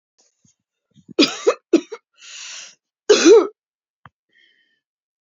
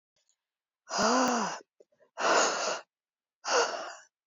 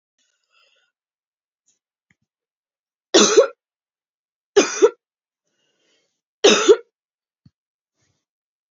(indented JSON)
{
  "cough_length": "5.2 s",
  "cough_amplitude": 28778,
  "cough_signal_mean_std_ratio": 0.29,
  "exhalation_length": "4.3 s",
  "exhalation_amplitude": 7891,
  "exhalation_signal_mean_std_ratio": 0.52,
  "three_cough_length": "8.7 s",
  "three_cough_amplitude": 30073,
  "three_cough_signal_mean_std_ratio": 0.24,
  "survey_phase": "beta (2021-08-13 to 2022-03-07)",
  "age": "45-64",
  "gender": "Female",
  "wearing_mask": "Yes",
  "symptom_cough_any": true,
  "symptom_runny_or_blocked_nose": true,
  "symptom_shortness_of_breath": true,
  "symptom_sore_throat": true,
  "symptom_abdominal_pain": true,
  "symptom_fatigue": true,
  "symptom_headache": true,
  "symptom_change_to_sense_of_smell_or_taste": true,
  "smoker_status": "Never smoked",
  "respiratory_condition_asthma": false,
  "respiratory_condition_other": false,
  "recruitment_source": "Test and Trace",
  "submission_delay": "1 day",
  "covid_test_result": "Positive",
  "covid_test_method": "LFT"
}